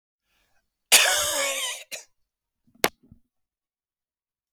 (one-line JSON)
{"cough_length": "4.5 s", "cough_amplitude": 32768, "cough_signal_mean_std_ratio": 0.31, "survey_phase": "beta (2021-08-13 to 2022-03-07)", "age": "45-64", "gender": "Male", "wearing_mask": "No", "symptom_none": true, "smoker_status": "Never smoked", "respiratory_condition_asthma": false, "respiratory_condition_other": false, "recruitment_source": "REACT", "submission_delay": "0 days", "covid_test_result": "Negative", "covid_test_method": "RT-qPCR", "influenza_a_test_result": "Negative", "influenza_b_test_result": "Negative"}